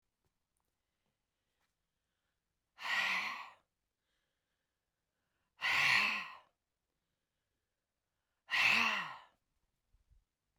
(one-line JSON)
{"exhalation_length": "10.6 s", "exhalation_amplitude": 4287, "exhalation_signal_mean_std_ratio": 0.33, "survey_phase": "beta (2021-08-13 to 2022-03-07)", "age": "65+", "gender": "Female", "wearing_mask": "No", "symptom_cough_any": true, "symptom_runny_or_blocked_nose": true, "symptom_sore_throat": true, "symptom_abdominal_pain": true, "symptom_fatigue": true, "symptom_fever_high_temperature": true, "symptom_headache": true, "symptom_onset": "3 days", "smoker_status": "Never smoked", "respiratory_condition_asthma": false, "respiratory_condition_other": false, "recruitment_source": "Test and Trace", "submission_delay": "1 day", "covid_test_result": "Positive", "covid_test_method": "RT-qPCR", "covid_ct_value": 18.6, "covid_ct_gene": "ORF1ab gene", "covid_ct_mean": 19.6, "covid_viral_load": "380000 copies/ml", "covid_viral_load_category": "Low viral load (10K-1M copies/ml)"}